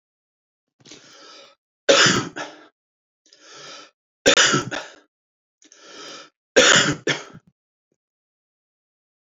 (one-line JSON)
{"three_cough_length": "9.4 s", "three_cough_amplitude": 29821, "three_cough_signal_mean_std_ratio": 0.31, "survey_phase": "beta (2021-08-13 to 2022-03-07)", "age": "45-64", "gender": "Male", "wearing_mask": "No", "symptom_shortness_of_breath": true, "symptom_headache": true, "symptom_onset": "12 days", "smoker_status": "Never smoked", "respiratory_condition_asthma": true, "respiratory_condition_other": false, "recruitment_source": "REACT", "submission_delay": "1 day", "covid_test_result": "Negative", "covid_test_method": "RT-qPCR"}